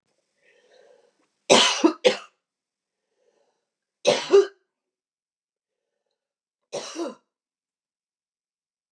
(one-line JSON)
{"three_cough_length": "8.9 s", "three_cough_amplitude": 29719, "three_cough_signal_mean_std_ratio": 0.24, "survey_phase": "beta (2021-08-13 to 2022-03-07)", "age": "45-64", "gender": "Female", "wearing_mask": "No", "symptom_cough_any": true, "symptom_sore_throat": true, "symptom_fatigue": true, "symptom_headache": true, "smoker_status": "Never smoked", "respiratory_condition_asthma": false, "respiratory_condition_other": false, "recruitment_source": "Test and Trace", "submission_delay": "2 days", "covid_test_result": "Negative", "covid_test_method": "RT-qPCR"}